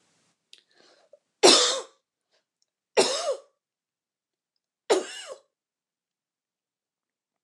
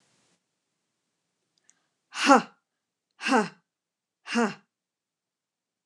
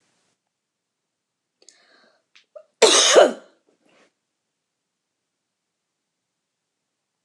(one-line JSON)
{"three_cough_length": "7.4 s", "three_cough_amplitude": 26769, "three_cough_signal_mean_std_ratio": 0.25, "exhalation_length": "5.9 s", "exhalation_amplitude": 26064, "exhalation_signal_mean_std_ratio": 0.23, "cough_length": "7.2 s", "cough_amplitude": 29200, "cough_signal_mean_std_ratio": 0.21, "survey_phase": "beta (2021-08-13 to 2022-03-07)", "age": "45-64", "gender": "Female", "wearing_mask": "No", "symptom_none": true, "smoker_status": "Never smoked", "respiratory_condition_asthma": true, "respiratory_condition_other": false, "recruitment_source": "REACT", "submission_delay": "2 days", "covid_test_result": "Negative", "covid_test_method": "RT-qPCR", "influenza_a_test_result": "Negative", "influenza_b_test_result": "Negative"}